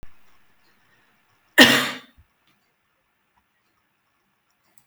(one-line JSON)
{"cough_length": "4.9 s", "cough_amplitude": 32092, "cough_signal_mean_std_ratio": 0.2, "survey_phase": "alpha (2021-03-01 to 2021-08-12)", "age": "18-44", "gender": "Female", "wearing_mask": "No", "symptom_none": true, "smoker_status": "Never smoked", "respiratory_condition_asthma": false, "respiratory_condition_other": false, "recruitment_source": "REACT", "submission_delay": "4 days", "covid_test_result": "Negative", "covid_test_method": "RT-qPCR"}